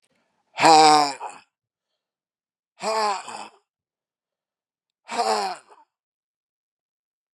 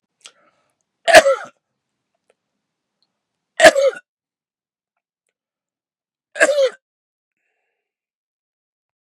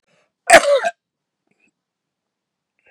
{"exhalation_length": "7.3 s", "exhalation_amplitude": 28990, "exhalation_signal_mean_std_ratio": 0.3, "three_cough_length": "9.0 s", "three_cough_amplitude": 32768, "three_cough_signal_mean_std_ratio": 0.22, "cough_length": "2.9 s", "cough_amplitude": 32768, "cough_signal_mean_std_ratio": 0.25, "survey_phase": "beta (2021-08-13 to 2022-03-07)", "age": "45-64", "gender": "Male", "wearing_mask": "No", "symptom_cough_any": true, "symptom_runny_or_blocked_nose": true, "symptom_fatigue": true, "smoker_status": "Never smoked", "respiratory_condition_asthma": true, "respiratory_condition_other": false, "recruitment_source": "Test and Trace", "submission_delay": "1 day", "covid_test_result": "Positive", "covid_test_method": "RT-qPCR", "covid_ct_value": 13.4, "covid_ct_gene": "ORF1ab gene"}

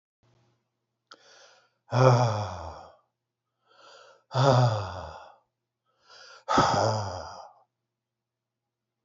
{"exhalation_length": "9.0 s", "exhalation_amplitude": 14949, "exhalation_signal_mean_std_ratio": 0.38, "survey_phase": "beta (2021-08-13 to 2022-03-07)", "age": "65+", "gender": "Male", "wearing_mask": "No", "symptom_none": true, "smoker_status": "Never smoked", "respiratory_condition_asthma": false, "respiratory_condition_other": false, "recruitment_source": "REACT", "submission_delay": "1 day", "covid_test_result": "Negative", "covid_test_method": "RT-qPCR", "influenza_a_test_result": "Negative", "influenza_b_test_result": "Negative"}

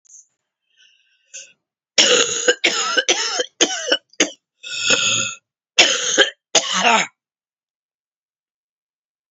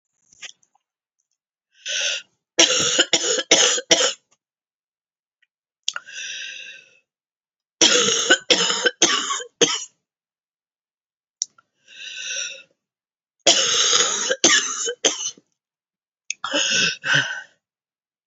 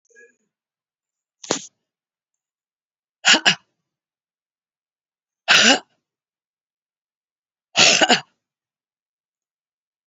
{"cough_length": "9.3 s", "cough_amplitude": 32767, "cough_signal_mean_std_ratio": 0.45, "three_cough_length": "18.3 s", "three_cough_amplitude": 32768, "three_cough_signal_mean_std_ratio": 0.44, "exhalation_length": "10.1 s", "exhalation_amplitude": 31738, "exhalation_signal_mean_std_ratio": 0.24, "survey_phase": "beta (2021-08-13 to 2022-03-07)", "age": "45-64", "gender": "Female", "wearing_mask": "No", "symptom_cough_any": true, "symptom_runny_or_blocked_nose": true, "symptom_shortness_of_breath": true, "symptom_sore_throat": true, "symptom_abdominal_pain": true, "symptom_fatigue": true, "symptom_headache": true, "symptom_change_to_sense_of_smell_or_taste": true, "symptom_loss_of_taste": true, "symptom_onset": "7 days", "smoker_status": "Never smoked", "respiratory_condition_asthma": false, "respiratory_condition_other": false, "recruitment_source": "Test and Trace", "submission_delay": "2 days", "covid_test_result": "Positive", "covid_test_method": "RT-qPCR", "covid_ct_value": 15.2, "covid_ct_gene": "ORF1ab gene", "covid_ct_mean": 15.9, "covid_viral_load": "6000000 copies/ml", "covid_viral_load_category": "High viral load (>1M copies/ml)"}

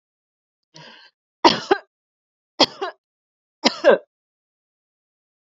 {"three_cough_length": "5.5 s", "three_cough_amplitude": 32768, "three_cough_signal_mean_std_ratio": 0.22, "survey_phase": "beta (2021-08-13 to 2022-03-07)", "age": "18-44", "gender": "Female", "wearing_mask": "No", "symptom_cough_any": true, "symptom_headache": true, "symptom_change_to_sense_of_smell_or_taste": true, "smoker_status": "Never smoked", "respiratory_condition_asthma": false, "respiratory_condition_other": false, "recruitment_source": "Test and Trace", "submission_delay": "2 days", "covid_test_result": "Positive", "covid_test_method": "RT-qPCR"}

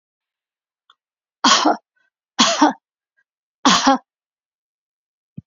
{"three_cough_length": "5.5 s", "three_cough_amplitude": 31876, "three_cough_signal_mean_std_ratio": 0.32, "survey_phase": "beta (2021-08-13 to 2022-03-07)", "age": "65+", "gender": "Female", "wearing_mask": "No", "symptom_none": true, "smoker_status": "Ex-smoker", "respiratory_condition_asthma": false, "respiratory_condition_other": false, "recruitment_source": "REACT", "submission_delay": "1 day", "covid_test_result": "Negative", "covid_test_method": "RT-qPCR"}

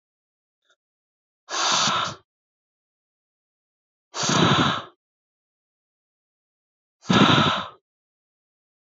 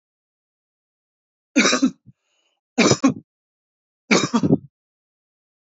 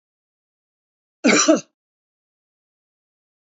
{"exhalation_length": "8.9 s", "exhalation_amplitude": 20660, "exhalation_signal_mean_std_ratio": 0.35, "three_cough_length": "5.6 s", "three_cough_amplitude": 29106, "three_cough_signal_mean_std_ratio": 0.33, "cough_length": "3.4 s", "cough_amplitude": 24102, "cough_signal_mean_std_ratio": 0.25, "survey_phase": "beta (2021-08-13 to 2022-03-07)", "age": "18-44", "gender": "Male", "wearing_mask": "No", "symptom_none": true, "smoker_status": "Never smoked", "respiratory_condition_asthma": true, "respiratory_condition_other": false, "recruitment_source": "Test and Trace", "submission_delay": "0 days", "covid_test_result": "Negative", "covid_test_method": "LFT"}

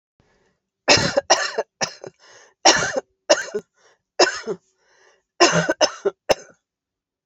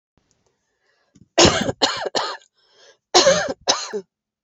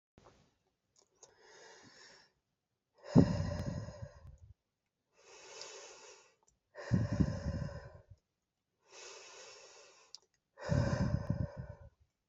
{"three_cough_length": "7.3 s", "three_cough_amplitude": 32768, "three_cough_signal_mean_std_ratio": 0.37, "cough_length": "4.4 s", "cough_amplitude": 32688, "cough_signal_mean_std_ratio": 0.4, "exhalation_length": "12.3 s", "exhalation_amplitude": 10028, "exhalation_signal_mean_std_ratio": 0.34, "survey_phase": "beta (2021-08-13 to 2022-03-07)", "age": "45-64", "gender": "Female", "wearing_mask": "No", "symptom_none": true, "smoker_status": "Never smoked", "respiratory_condition_asthma": false, "respiratory_condition_other": true, "recruitment_source": "REACT", "submission_delay": "2 days", "covid_test_result": "Negative", "covid_test_method": "RT-qPCR"}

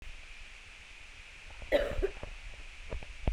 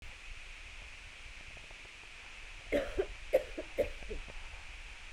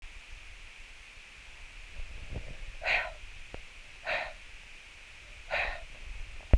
{"cough_length": "3.3 s", "cough_amplitude": 6363, "cough_signal_mean_std_ratio": 0.58, "three_cough_length": "5.1 s", "three_cough_amplitude": 5297, "three_cough_signal_mean_std_ratio": 0.6, "exhalation_length": "6.6 s", "exhalation_amplitude": 13291, "exhalation_signal_mean_std_ratio": 0.48, "survey_phase": "beta (2021-08-13 to 2022-03-07)", "age": "18-44", "gender": "Female", "wearing_mask": "No", "symptom_none": true, "symptom_onset": "4 days", "smoker_status": "Never smoked", "respiratory_condition_asthma": false, "respiratory_condition_other": false, "recruitment_source": "Test and Trace", "submission_delay": "2 days", "covid_test_result": "Positive", "covid_test_method": "ePCR"}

